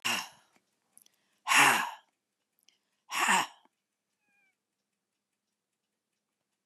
{
  "exhalation_length": "6.7 s",
  "exhalation_amplitude": 12486,
  "exhalation_signal_mean_std_ratio": 0.28,
  "survey_phase": "beta (2021-08-13 to 2022-03-07)",
  "age": "65+",
  "gender": "Female",
  "wearing_mask": "No",
  "symptom_none": true,
  "smoker_status": "Never smoked",
  "respiratory_condition_asthma": false,
  "respiratory_condition_other": false,
  "recruitment_source": "REACT",
  "submission_delay": "2 days",
  "covid_test_result": "Negative",
  "covid_test_method": "RT-qPCR",
  "influenza_a_test_result": "Negative",
  "influenza_b_test_result": "Negative"
}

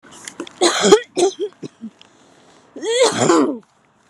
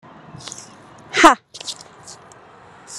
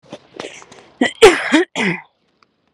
{
  "three_cough_length": "4.1 s",
  "three_cough_amplitude": 32768,
  "three_cough_signal_mean_std_ratio": 0.49,
  "exhalation_length": "3.0 s",
  "exhalation_amplitude": 32768,
  "exhalation_signal_mean_std_ratio": 0.25,
  "cough_length": "2.7 s",
  "cough_amplitude": 32768,
  "cough_signal_mean_std_ratio": 0.37,
  "survey_phase": "alpha (2021-03-01 to 2021-08-12)",
  "age": "18-44",
  "gender": "Female",
  "wearing_mask": "Yes",
  "symptom_none": true,
  "smoker_status": "Ex-smoker",
  "respiratory_condition_asthma": false,
  "respiratory_condition_other": false,
  "recruitment_source": "REACT",
  "submission_delay": "3 days",
  "covid_test_result": "Negative",
  "covid_test_method": "RT-qPCR"
}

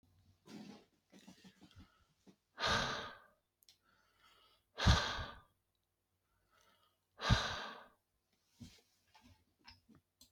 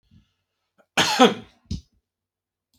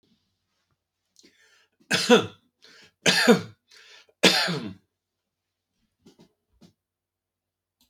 {
  "exhalation_length": "10.3 s",
  "exhalation_amplitude": 4562,
  "exhalation_signal_mean_std_ratio": 0.28,
  "cough_length": "2.8 s",
  "cough_amplitude": 31911,
  "cough_signal_mean_std_ratio": 0.27,
  "three_cough_length": "7.9 s",
  "three_cough_amplitude": 26392,
  "three_cough_signal_mean_std_ratio": 0.27,
  "survey_phase": "beta (2021-08-13 to 2022-03-07)",
  "age": "65+",
  "gender": "Male",
  "wearing_mask": "No",
  "symptom_none": true,
  "smoker_status": "Ex-smoker",
  "respiratory_condition_asthma": false,
  "respiratory_condition_other": false,
  "recruitment_source": "REACT",
  "submission_delay": "1 day",
  "covid_test_result": "Negative",
  "covid_test_method": "RT-qPCR"
}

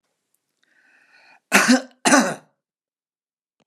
{
  "cough_length": "3.7 s",
  "cough_amplitude": 32767,
  "cough_signal_mean_std_ratio": 0.3,
  "survey_phase": "beta (2021-08-13 to 2022-03-07)",
  "age": "65+",
  "gender": "Male",
  "wearing_mask": "No",
  "symptom_none": true,
  "smoker_status": "Ex-smoker",
  "respiratory_condition_asthma": false,
  "respiratory_condition_other": false,
  "recruitment_source": "REACT",
  "submission_delay": "2 days",
  "covid_test_result": "Negative",
  "covid_test_method": "RT-qPCR"
}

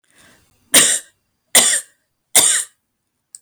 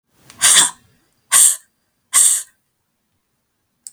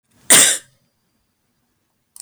{
  "three_cough_length": "3.4 s",
  "three_cough_amplitude": 32768,
  "three_cough_signal_mean_std_ratio": 0.38,
  "exhalation_length": "3.9 s",
  "exhalation_amplitude": 32768,
  "exhalation_signal_mean_std_ratio": 0.36,
  "cough_length": "2.2 s",
  "cough_amplitude": 32768,
  "cough_signal_mean_std_ratio": 0.28,
  "survey_phase": "beta (2021-08-13 to 2022-03-07)",
  "age": "65+",
  "gender": "Female",
  "wearing_mask": "No",
  "symptom_none": true,
  "smoker_status": "Never smoked",
  "respiratory_condition_asthma": false,
  "respiratory_condition_other": false,
  "recruitment_source": "REACT",
  "submission_delay": "1 day",
  "covid_test_result": "Negative",
  "covid_test_method": "RT-qPCR",
  "influenza_a_test_result": "Negative",
  "influenza_b_test_result": "Negative"
}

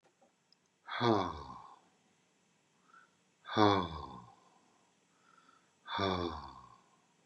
{
  "exhalation_length": "7.3 s",
  "exhalation_amplitude": 8592,
  "exhalation_signal_mean_std_ratio": 0.33,
  "survey_phase": "beta (2021-08-13 to 2022-03-07)",
  "age": "65+",
  "gender": "Male",
  "wearing_mask": "No",
  "symptom_none": true,
  "smoker_status": "Ex-smoker",
  "respiratory_condition_asthma": false,
  "respiratory_condition_other": false,
  "recruitment_source": "REACT",
  "submission_delay": "3 days",
  "covid_test_result": "Negative",
  "covid_test_method": "RT-qPCR",
  "influenza_a_test_result": "Negative",
  "influenza_b_test_result": "Negative"
}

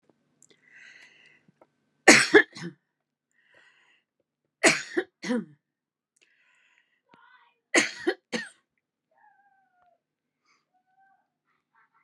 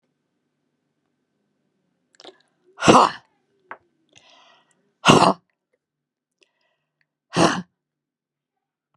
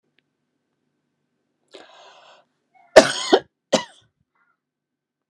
{
  "three_cough_length": "12.0 s",
  "three_cough_amplitude": 32765,
  "three_cough_signal_mean_std_ratio": 0.2,
  "exhalation_length": "9.0 s",
  "exhalation_amplitude": 32768,
  "exhalation_signal_mean_std_ratio": 0.22,
  "cough_length": "5.3 s",
  "cough_amplitude": 32768,
  "cough_signal_mean_std_ratio": 0.17,
  "survey_phase": "beta (2021-08-13 to 2022-03-07)",
  "age": "65+",
  "gender": "Female",
  "wearing_mask": "No",
  "symptom_diarrhoea": true,
  "symptom_fatigue": true,
  "symptom_headache": true,
  "smoker_status": "Ex-smoker",
  "respiratory_condition_asthma": true,
  "respiratory_condition_other": false,
  "recruitment_source": "REACT",
  "submission_delay": "1 day",
  "covid_test_result": "Negative",
  "covid_test_method": "RT-qPCR"
}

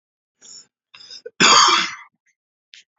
{
  "cough_length": "3.0 s",
  "cough_amplitude": 30633,
  "cough_signal_mean_std_ratio": 0.34,
  "survey_phase": "beta (2021-08-13 to 2022-03-07)",
  "age": "18-44",
  "gender": "Male",
  "wearing_mask": "No",
  "symptom_cough_any": true,
  "symptom_runny_or_blocked_nose": true,
  "symptom_sore_throat": true,
  "smoker_status": "Never smoked",
  "respiratory_condition_asthma": false,
  "respiratory_condition_other": false,
  "recruitment_source": "REACT",
  "submission_delay": "2 days",
  "covid_test_result": "Negative",
  "covid_test_method": "RT-qPCR"
}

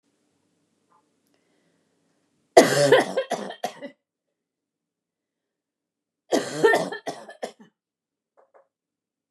{
  "cough_length": "9.3 s",
  "cough_amplitude": 29204,
  "cough_signal_mean_std_ratio": 0.27,
  "survey_phase": "beta (2021-08-13 to 2022-03-07)",
  "age": "45-64",
  "gender": "Female",
  "wearing_mask": "No",
  "symptom_cough_any": true,
  "smoker_status": "Never smoked",
  "respiratory_condition_asthma": false,
  "respiratory_condition_other": false,
  "recruitment_source": "REACT",
  "submission_delay": "1 day",
  "covid_test_result": "Negative",
  "covid_test_method": "RT-qPCR",
  "influenza_a_test_result": "Negative",
  "influenza_b_test_result": "Negative"
}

